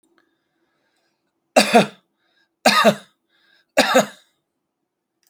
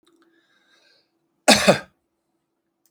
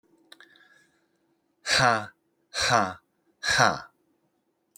{"three_cough_length": "5.3 s", "three_cough_amplitude": 31569, "three_cough_signal_mean_std_ratio": 0.3, "cough_length": "2.9 s", "cough_amplitude": 31611, "cough_signal_mean_std_ratio": 0.23, "exhalation_length": "4.8 s", "exhalation_amplitude": 19014, "exhalation_signal_mean_std_ratio": 0.36, "survey_phase": "beta (2021-08-13 to 2022-03-07)", "age": "45-64", "gender": "Male", "wearing_mask": "No", "symptom_none": true, "smoker_status": "Ex-smoker", "respiratory_condition_asthma": false, "respiratory_condition_other": false, "recruitment_source": "REACT", "submission_delay": "2 days", "covid_test_result": "Negative", "covid_test_method": "RT-qPCR"}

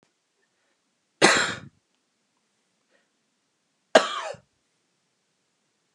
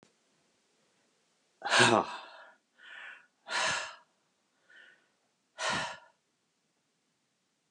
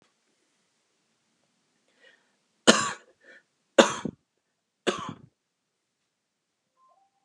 {"cough_length": "5.9 s", "cough_amplitude": 29886, "cough_signal_mean_std_ratio": 0.21, "exhalation_length": "7.7 s", "exhalation_amplitude": 10372, "exhalation_signal_mean_std_ratio": 0.29, "three_cough_length": "7.2 s", "three_cough_amplitude": 31183, "three_cough_signal_mean_std_ratio": 0.18, "survey_phase": "alpha (2021-03-01 to 2021-08-12)", "age": "65+", "gender": "Male", "wearing_mask": "No", "symptom_none": true, "smoker_status": "Never smoked", "respiratory_condition_asthma": false, "respiratory_condition_other": false, "recruitment_source": "REACT", "submission_delay": "2 days", "covid_test_result": "Negative", "covid_test_method": "RT-qPCR"}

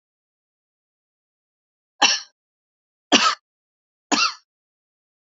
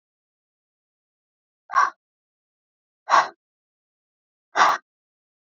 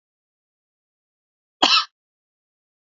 {"three_cough_length": "5.3 s", "three_cough_amplitude": 32767, "three_cough_signal_mean_std_ratio": 0.25, "exhalation_length": "5.5 s", "exhalation_amplitude": 23334, "exhalation_signal_mean_std_ratio": 0.23, "cough_length": "3.0 s", "cough_amplitude": 32591, "cough_signal_mean_std_ratio": 0.2, "survey_phase": "beta (2021-08-13 to 2022-03-07)", "age": "45-64", "gender": "Female", "wearing_mask": "No", "symptom_none": true, "smoker_status": "Never smoked", "respiratory_condition_asthma": false, "respiratory_condition_other": false, "recruitment_source": "REACT", "submission_delay": "1 day", "covid_test_result": "Negative", "covid_test_method": "RT-qPCR", "influenza_a_test_result": "Negative", "influenza_b_test_result": "Negative"}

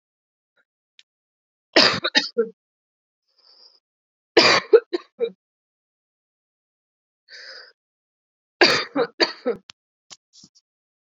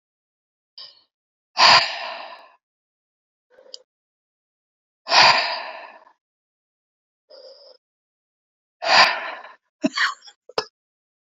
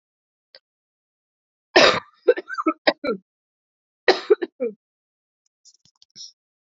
{"three_cough_length": "11.1 s", "three_cough_amplitude": 30941, "three_cough_signal_mean_std_ratio": 0.26, "exhalation_length": "11.3 s", "exhalation_amplitude": 30324, "exhalation_signal_mean_std_ratio": 0.28, "cough_length": "6.7 s", "cough_amplitude": 31928, "cough_signal_mean_std_ratio": 0.26, "survey_phase": "alpha (2021-03-01 to 2021-08-12)", "age": "18-44", "gender": "Female", "wearing_mask": "No", "symptom_cough_any": true, "symptom_new_continuous_cough": true, "symptom_fatigue": true, "symptom_loss_of_taste": true, "symptom_onset": "4 days", "smoker_status": "Never smoked", "respiratory_condition_asthma": false, "respiratory_condition_other": false, "recruitment_source": "Test and Trace", "submission_delay": "2 days", "covid_test_result": "Positive", "covid_test_method": "RT-qPCR"}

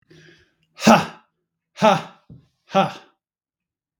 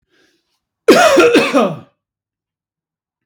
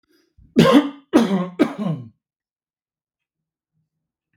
{"exhalation_length": "4.0 s", "exhalation_amplitude": 32767, "exhalation_signal_mean_std_ratio": 0.28, "cough_length": "3.3 s", "cough_amplitude": 32768, "cough_signal_mean_std_ratio": 0.43, "three_cough_length": "4.4 s", "three_cough_amplitude": 32767, "three_cough_signal_mean_std_ratio": 0.35, "survey_phase": "beta (2021-08-13 to 2022-03-07)", "age": "45-64", "gender": "Male", "wearing_mask": "No", "symptom_none": true, "smoker_status": "Ex-smoker", "respiratory_condition_asthma": false, "respiratory_condition_other": false, "recruitment_source": "REACT", "submission_delay": "1 day", "covid_test_result": "Negative", "covid_test_method": "RT-qPCR", "influenza_a_test_result": "Negative", "influenza_b_test_result": "Negative"}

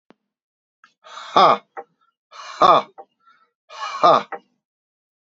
{"exhalation_length": "5.3 s", "exhalation_amplitude": 28886, "exhalation_signal_mean_std_ratio": 0.3, "survey_phase": "beta (2021-08-13 to 2022-03-07)", "age": "45-64", "gender": "Male", "wearing_mask": "No", "symptom_none": true, "smoker_status": "Ex-smoker", "respiratory_condition_asthma": false, "respiratory_condition_other": false, "recruitment_source": "REACT", "submission_delay": "1 day", "covid_test_result": "Negative", "covid_test_method": "RT-qPCR", "influenza_a_test_result": "Negative", "influenza_b_test_result": "Negative"}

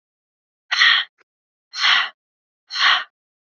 {"exhalation_length": "3.4 s", "exhalation_amplitude": 27207, "exhalation_signal_mean_std_ratio": 0.41, "survey_phase": "beta (2021-08-13 to 2022-03-07)", "age": "18-44", "gender": "Female", "wearing_mask": "No", "symptom_none": true, "smoker_status": "Never smoked", "respiratory_condition_asthma": false, "respiratory_condition_other": false, "recruitment_source": "REACT", "submission_delay": "3 days", "covid_test_result": "Negative", "covid_test_method": "RT-qPCR", "influenza_a_test_result": "Negative", "influenza_b_test_result": "Negative"}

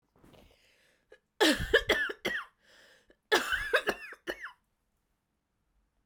{"cough_length": "6.1 s", "cough_amplitude": 10207, "cough_signal_mean_std_ratio": 0.36, "survey_phase": "beta (2021-08-13 to 2022-03-07)", "age": "45-64", "gender": "Female", "wearing_mask": "No", "symptom_cough_any": true, "symptom_runny_or_blocked_nose": true, "symptom_sore_throat": true, "symptom_fatigue": true, "symptom_fever_high_temperature": true, "symptom_headache": true, "symptom_change_to_sense_of_smell_or_taste": true, "symptom_loss_of_taste": true, "symptom_other": true, "symptom_onset": "2 days", "smoker_status": "Never smoked", "respiratory_condition_asthma": false, "respiratory_condition_other": false, "recruitment_source": "Test and Trace", "submission_delay": "2 days", "covid_test_method": "RT-qPCR", "covid_ct_value": 26.7, "covid_ct_gene": "ORF1ab gene"}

